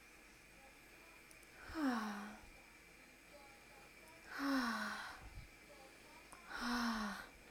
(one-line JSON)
{"exhalation_length": "7.5 s", "exhalation_amplitude": 1342, "exhalation_signal_mean_std_ratio": 0.59, "survey_phase": "alpha (2021-03-01 to 2021-08-12)", "age": "18-44", "gender": "Female", "wearing_mask": "No", "symptom_none": true, "smoker_status": "Never smoked", "respiratory_condition_asthma": false, "respiratory_condition_other": false, "recruitment_source": "REACT", "submission_delay": "1 day", "covid_test_result": "Negative", "covid_test_method": "RT-qPCR"}